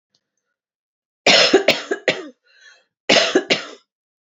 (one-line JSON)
{"cough_length": "4.3 s", "cough_amplitude": 29150, "cough_signal_mean_std_ratio": 0.39, "survey_phase": "alpha (2021-03-01 to 2021-08-12)", "age": "65+", "gender": "Female", "wearing_mask": "No", "symptom_fatigue": true, "smoker_status": "Never smoked", "respiratory_condition_asthma": false, "respiratory_condition_other": false, "recruitment_source": "REACT", "submission_delay": "5 days", "covid_test_result": "Negative", "covid_test_method": "RT-qPCR"}